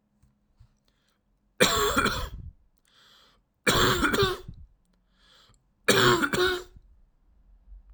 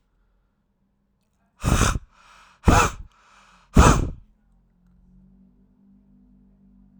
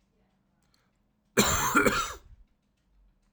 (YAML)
three_cough_length: 7.9 s
three_cough_amplitude: 18566
three_cough_signal_mean_std_ratio: 0.43
exhalation_length: 7.0 s
exhalation_amplitude: 32768
exhalation_signal_mean_std_ratio: 0.28
cough_length: 3.3 s
cough_amplitude: 16086
cough_signal_mean_std_ratio: 0.37
survey_phase: alpha (2021-03-01 to 2021-08-12)
age: 18-44
gender: Male
wearing_mask: 'No'
symptom_none: true
smoker_status: Never smoked
respiratory_condition_asthma: false
respiratory_condition_other: false
recruitment_source: REACT
submission_delay: 1 day
covid_test_result: Negative
covid_test_method: RT-qPCR